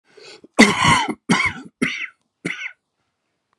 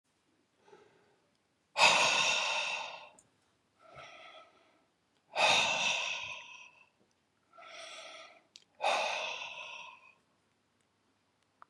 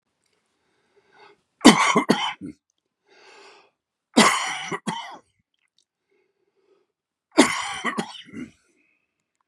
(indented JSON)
{
  "cough_length": "3.6 s",
  "cough_amplitude": 32768,
  "cough_signal_mean_std_ratio": 0.41,
  "exhalation_length": "11.7 s",
  "exhalation_amplitude": 8910,
  "exhalation_signal_mean_std_ratio": 0.41,
  "three_cough_length": "9.5 s",
  "three_cough_amplitude": 32767,
  "three_cough_signal_mean_std_ratio": 0.29,
  "survey_phase": "alpha (2021-03-01 to 2021-08-12)",
  "age": "45-64",
  "gender": "Female",
  "wearing_mask": "No",
  "symptom_none": true,
  "smoker_status": "Ex-smoker",
  "respiratory_condition_asthma": false,
  "respiratory_condition_other": false,
  "recruitment_source": "Test and Trace",
  "submission_delay": "1 day",
  "covid_test_result": "Negative",
  "covid_test_method": "RT-qPCR"
}